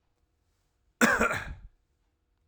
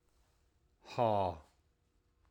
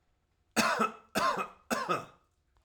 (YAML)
cough_length: 2.5 s
cough_amplitude: 13548
cough_signal_mean_std_ratio: 0.33
exhalation_length: 2.3 s
exhalation_amplitude: 3681
exhalation_signal_mean_std_ratio: 0.33
three_cough_length: 2.6 s
three_cough_amplitude: 7764
three_cough_signal_mean_std_ratio: 0.51
survey_phase: alpha (2021-03-01 to 2021-08-12)
age: 45-64
gender: Male
wearing_mask: 'No'
symptom_none: true
smoker_status: Ex-smoker
respiratory_condition_asthma: false
respiratory_condition_other: false
recruitment_source: REACT
submission_delay: 2 days
covid_test_result: Negative
covid_test_method: RT-qPCR